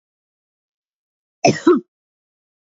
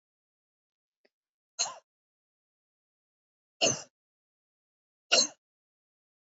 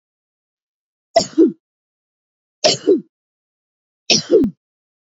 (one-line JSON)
{"cough_length": "2.7 s", "cough_amplitude": 27231, "cough_signal_mean_std_ratio": 0.24, "exhalation_length": "6.3 s", "exhalation_amplitude": 10076, "exhalation_signal_mean_std_ratio": 0.19, "three_cough_length": "5.0 s", "three_cough_amplitude": 32767, "three_cough_signal_mean_std_ratio": 0.32, "survey_phase": "beta (2021-08-13 to 2022-03-07)", "age": "45-64", "gender": "Female", "wearing_mask": "No", "symptom_cough_any": true, "smoker_status": "Ex-smoker", "respiratory_condition_asthma": false, "respiratory_condition_other": false, "recruitment_source": "REACT", "submission_delay": "1 day", "covid_test_result": "Negative", "covid_test_method": "RT-qPCR", "influenza_a_test_result": "Negative", "influenza_b_test_result": "Negative"}